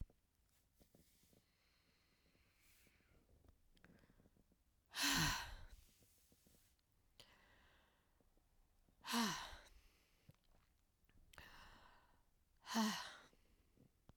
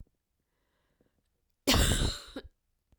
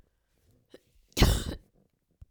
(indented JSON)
{
  "exhalation_length": "14.2 s",
  "exhalation_amplitude": 1584,
  "exhalation_signal_mean_std_ratio": 0.3,
  "cough_length": "3.0 s",
  "cough_amplitude": 10342,
  "cough_signal_mean_std_ratio": 0.35,
  "three_cough_length": "2.3 s",
  "three_cough_amplitude": 13658,
  "three_cough_signal_mean_std_ratio": 0.27,
  "survey_phase": "beta (2021-08-13 to 2022-03-07)",
  "age": "45-64",
  "gender": "Female",
  "wearing_mask": "No",
  "symptom_runny_or_blocked_nose": true,
  "symptom_shortness_of_breath": true,
  "symptom_sore_throat": true,
  "symptom_fatigue": true,
  "symptom_headache": true,
  "symptom_onset": "4 days",
  "smoker_status": "Never smoked",
  "respiratory_condition_asthma": false,
  "respiratory_condition_other": false,
  "recruitment_source": "Test and Trace",
  "submission_delay": "3 days",
  "covid_test_result": "Positive",
  "covid_test_method": "RT-qPCR",
  "covid_ct_value": 21.0,
  "covid_ct_gene": "ORF1ab gene",
  "covid_ct_mean": 21.6,
  "covid_viral_load": "81000 copies/ml",
  "covid_viral_load_category": "Low viral load (10K-1M copies/ml)"
}